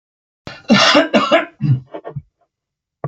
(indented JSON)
{
  "cough_length": "3.1 s",
  "cough_amplitude": 31599,
  "cough_signal_mean_std_ratio": 0.47,
  "survey_phase": "alpha (2021-03-01 to 2021-08-12)",
  "age": "65+",
  "gender": "Male",
  "wearing_mask": "No",
  "symptom_none": true,
  "smoker_status": "Never smoked",
  "respiratory_condition_asthma": false,
  "respiratory_condition_other": false,
  "recruitment_source": "REACT",
  "submission_delay": "2 days",
  "covid_test_result": "Negative",
  "covid_test_method": "RT-qPCR"
}